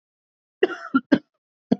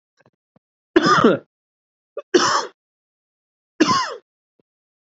{
  "cough_length": "1.8 s",
  "cough_amplitude": 25347,
  "cough_signal_mean_std_ratio": 0.27,
  "three_cough_length": "5.0 s",
  "three_cough_amplitude": 27936,
  "three_cough_signal_mean_std_ratio": 0.35,
  "survey_phase": "beta (2021-08-13 to 2022-03-07)",
  "age": "18-44",
  "gender": "Male",
  "wearing_mask": "No",
  "symptom_cough_any": true,
  "symptom_runny_or_blocked_nose": true,
  "symptom_shortness_of_breath": true,
  "smoker_status": "Ex-smoker",
  "respiratory_condition_asthma": false,
  "respiratory_condition_other": false,
  "recruitment_source": "Test and Trace",
  "submission_delay": "1 day",
  "covid_test_result": "Positive",
  "covid_test_method": "RT-qPCR",
  "covid_ct_value": 23.5,
  "covid_ct_gene": "ORF1ab gene"
}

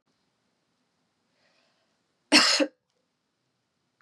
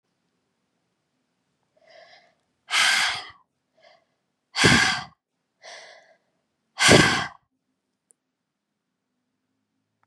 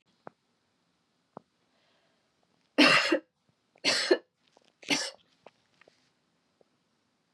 {
  "cough_length": "4.0 s",
  "cough_amplitude": 19887,
  "cough_signal_mean_std_ratio": 0.22,
  "exhalation_length": "10.1 s",
  "exhalation_amplitude": 30970,
  "exhalation_signal_mean_std_ratio": 0.28,
  "three_cough_length": "7.3 s",
  "three_cough_amplitude": 16390,
  "three_cough_signal_mean_std_ratio": 0.26,
  "survey_phase": "beta (2021-08-13 to 2022-03-07)",
  "age": "18-44",
  "gender": "Female",
  "wearing_mask": "No",
  "symptom_runny_or_blocked_nose": true,
  "symptom_fatigue": true,
  "symptom_change_to_sense_of_smell_or_taste": true,
  "smoker_status": "Never smoked",
  "respiratory_condition_asthma": false,
  "respiratory_condition_other": false,
  "recruitment_source": "Test and Trace",
  "submission_delay": "2 days",
  "covid_test_result": "Positive",
  "covid_test_method": "RT-qPCR",
  "covid_ct_value": 22.1,
  "covid_ct_gene": "ORF1ab gene",
  "covid_ct_mean": 22.7,
  "covid_viral_load": "35000 copies/ml",
  "covid_viral_load_category": "Low viral load (10K-1M copies/ml)"
}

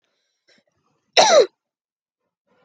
{
  "cough_length": "2.6 s",
  "cough_amplitude": 29644,
  "cough_signal_mean_std_ratio": 0.27,
  "survey_phase": "alpha (2021-03-01 to 2021-08-12)",
  "age": "18-44",
  "gender": "Female",
  "wearing_mask": "No",
  "symptom_none": true,
  "symptom_onset": "12 days",
  "smoker_status": "Never smoked",
  "respiratory_condition_asthma": false,
  "respiratory_condition_other": false,
  "recruitment_source": "REACT",
  "submission_delay": "1 day",
  "covid_test_result": "Negative",
  "covid_test_method": "RT-qPCR"
}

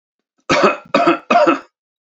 {
  "three_cough_length": "2.0 s",
  "three_cough_amplitude": 28357,
  "three_cough_signal_mean_std_ratio": 0.53,
  "survey_phase": "beta (2021-08-13 to 2022-03-07)",
  "age": "65+",
  "gender": "Male",
  "wearing_mask": "No",
  "symptom_cough_any": true,
  "symptom_sore_throat": true,
  "smoker_status": "Never smoked",
  "respiratory_condition_asthma": false,
  "respiratory_condition_other": false,
  "recruitment_source": "REACT",
  "submission_delay": "1 day",
  "covid_test_result": "Negative",
  "covid_test_method": "RT-qPCR",
  "influenza_a_test_result": "Negative",
  "influenza_b_test_result": "Negative"
}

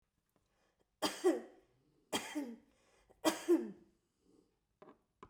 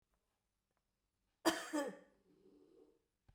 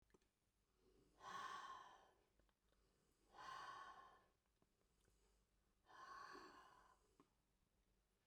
{
  "three_cough_length": "5.3 s",
  "three_cough_amplitude": 4178,
  "three_cough_signal_mean_std_ratio": 0.32,
  "cough_length": "3.3 s",
  "cough_amplitude": 2916,
  "cough_signal_mean_std_ratio": 0.27,
  "exhalation_length": "8.3 s",
  "exhalation_amplitude": 205,
  "exhalation_signal_mean_std_ratio": 0.51,
  "survey_phase": "beta (2021-08-13 to 2022-03-07)",
  "age": "65+",
  "gender": "Female",
  "wearing_mask": "No",
  "symptom_shortness_of_breath": true,
  "smoker_status": "Ex-smoker",
  "respiratory_condition_asthma": false,
  "respiratory_condition_other": true,
  "recruitment_source": "REACT",
  "submission_delay": "1 day",
  "covid_test_result": "Negative",
  "covid_test_method": "RT-qPCR"
}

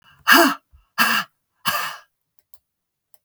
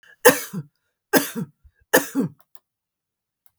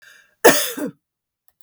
{
  "exhalation_length": "3.2 s",
  "exhalation_amplitude": 32768,
  "exhalation_signal_mean_std_ratio": 0.36,
  "three_cough_length": "3.6 s",
  "three_cough_amplitude": 32768,
  "three_cough_signal_mean_std_ratio": 0.29,
  "cough_length": "1.6 s",
  "cough_amplitude": 32768,
  "cough_signal_mean_std_ratio": 0.32,
  "survey_phase": "beta (2021-08-13 to 2022-03-07)",
  "age": "65+",
  "gender": "Female",
  "wearing_mask": "No",
  "symptom_none": true,
  "smoker_status": "Ex-smoker",
  "respiratory_condition_asthma": false,
  "respiratory_condition_other": false,
  "recruitment_source": "REACT",
  "submission_delay": "1 day",
  "covid_test_result": "Negative",
  "covid_test_method": "RT-qPCR",
  "influenza_a_test_result": "Negative",
  "influenza_b_test_result": "Negative"
}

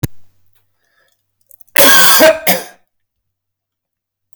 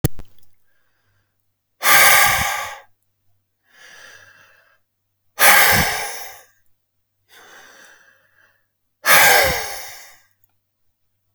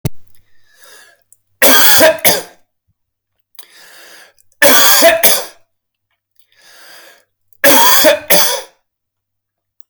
{
  "cough_length": "4.4 s",
  "cough_amplitude": 32768,
  "cough_signal_mean_std_ratio": 0.38,
  "exhalation_length": "11.3 s",
  "exhalation_amplitude": 32768,
  "exhalation_signal_mean_std_ratio": 0.37,
  "three_cough_length": "9.9 s",
  "three_cough_amplitude": 32768,
  "three_cough_signal_mean_std_ratio": 0.45,
  "survey_phase": "alpha (2021-03-01 to 2021-08-12)",
  "age": "45-64",
  "gender": "Male",
  "wearing_mask": "No",
  "symptom_none": true,
  "smoker_status": "Never smoked",
  "respiratory_condition_asthma": false,
  "respiratory_condition_other": false,
  "recruitment_source": "REACT",
  "submission_delay": "1 day",
  "covid_test_result": "Negative",
  "covid_test_method": "RT-qPCR"
}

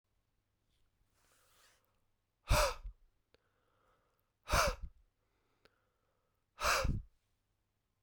{
  "exhalation_length": "8.0 s",
  "exhalation_amplitude": 4307,
  "exhalation_signal_mean_std_ratio": 0.28,
  "survey_phase": "beta (2021-08-13 to 2022-03-07)",
  "age": "18-44",
  "gender": "Male",
  "wearing_mask": "No",
  "symptom_none": true,
  "smoker_status": "Ex-smoker",
  "respiratory_condition_asthma": false,
  "respiratory_condition_other": false,
  "recruitment_source": "REACT",
  "submission_delay": "1 day",
  "covid_test_result": "Negative",
  "covid_test_method": "RT-qPCR"
}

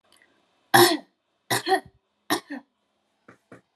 {
  "three_cough_length": "3.8 s",
  "three_cough_amplitude": 26953,
  "three_cough_signal_mean_std_ratio": 0.29,
  "survey_phase": "alpha (2021-03-01 to 2021-08-12)",
  "age": "18-44",
  "gender": "Female",
  "wearing_mask": "No",
  "symptom_none": true,
  "smoker_status": "Ex-smoker",
  "respiratory_condition_asthma": true,
  "respiratory_condition_other": false,
  "recruitment_source": "REACT",
  "submission_delay": "1 day",
  "covid_test_result": "Negative",
  "covid_test_method": "RT-qPCR"
}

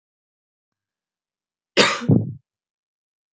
{
  "cough_length": "3.3 s",
  "cough_amplitude": 27596,
  "cough_signal_mean_std_ratio": 0.27,
  "survey_phase": "beta (2021-08-13 to 2022-03-07)",
  "age": "18-44",
  "gender": "Female",
  "wearing_mask": "No",
  "symptom_cough_any": true,
  "symptom_new_continuous_cough": true,
  "symptom_runny_or_blocked_nose": true,
  "symptom_sore_throat": true,
  "symptom_fatigue": true,
  "symptom_onset": "4 days",
  "smoker_status": "Never smoked",
  "respiratory_condition_asthma": false,
  "respiratory_condition_other": false,
  "recruitment_source": "Test and Trace",
  "submission_delay": "2 days",
  "covid_test_result": "Positive",
  "covid_test_method": "RT-qPCR",
  "covid_ct_value": 34.0,
  "covid_ct_gene": "N gene"
}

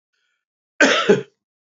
{
  "cough_length": "1.8 s",
  "cough_amplitude": 27684,
  "cough_signal_mean_std_ratio": 0.36,
  "survey_phase": "beta (2021-08-13 to 2022-03-07)",
  "age": "45-64",
  "gender": "Male",
  "wearing_mask": "No",
  "symptom_cough_any": true,
  "smoker_status": "Ex-smoker",
  "respiratory_condition_asthma": false,
  "respiratory_condition_other": false,
  "recruitment_source": "REACT",
  "submission_delay": "1 day",
  "covid_test_result": "Negative",
  "covid_test_method": "RT-qPCR",
  "influenza_a_test_result": "Negative",
  "influenza_b_test_result": "Negative"
}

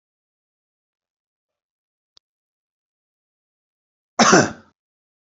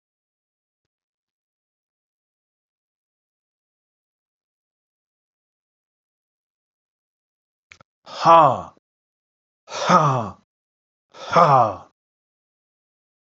{
  "cough_length": "5.4 s",
  "cough_amplitude": 30726,
  "cough_signal_mean_std_ratio": 0.18,
  "exhalation_length": "13.3 s",
  "exhalation_amplitude": 32767,
  "exhalation_signal_mean_std_ratio": 0.23,
  "survey_phase": "beta (2021-08-13 to 2022-03-07)",
  "age": "65+",
  "gender": "Male",
  "wearing_mask": "No",
  "symptom_none": true,
  "smoker_status": "Never smoked",
  "respiratory_condition_asthma": false,
  "respiratory_condition_other": false,
  "recruitment_source": "REACT",
  "submission_delay": "1 day",
  "covid_test_result": "Negative",
  "covid_test_method": "RT-qPCR",
  "influenza_a_test_result": "Negative",
  "influenza_b_test_result": "Negative"
}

